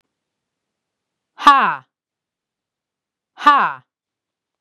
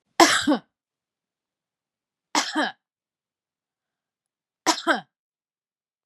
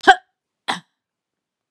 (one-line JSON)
{"exhalation_length": "4.6 s", "exhalation_amplitude": 32768, "exhalation_signal_mean_std_ratio": 0.26, "three_cough_length": "6.1 s", "three_cough_amplitude": 30150, "three_cough_signal_mean_std_ratio": 0.27, "cough_length": "1.7 s", "cough_amplitude": 32768, "cough_signal_mean_std_ratio": 0.2, "survey_phase": "beta (2021-08-13 to 2022-03-07)", "age": "45-64", "gender": "Female", "wearing_mask": "No", "symptom_none": true, "smoker_status": "Never smoked", "respiratory_condition_asthma": false, "respiratory_condition_other": false, "recruitment_source": "REACT", "submission_delay": "1 day", "covid_test_result": "Negative", "covid_test_method": "RT-qPCR", "influenza_a_test_result": "Negative", "influenza_b_test_result": "Negative"}